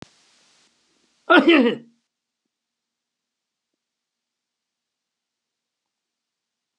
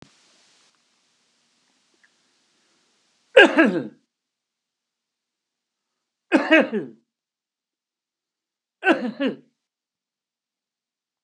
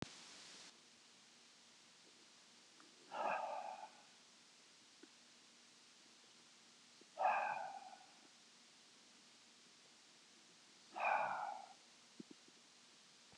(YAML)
cough_length: 6.8 s
cough_amplitude: 30593
cough_signal_mean_std_ratio: 0.2
three_cough_length: 11.2 s
three_cough_amplitude: 32235
three_cough_signal_mean_std_ratio: 0.22
exhalation_length: 13.4 s
exhalation_amplitude: 1736
exhalation_signal_mean_std_ratio: 0.41
survey_phase: beta (2021-08-13 to 2022-03-07)
age: 65+
gender: Male
wearing_mask: 'No'
symptom_none: true
smoker_status: Ex-smoker
respiratory_condition_asthma: false
respiratory_condition_other: false
recruitment_source: REACT
submission_delay: 5 days
covid_test_result: Negative
covid_test_method: RT-qPCR
influenza_a_test_result: Negative
influenza_b_test_result: Negative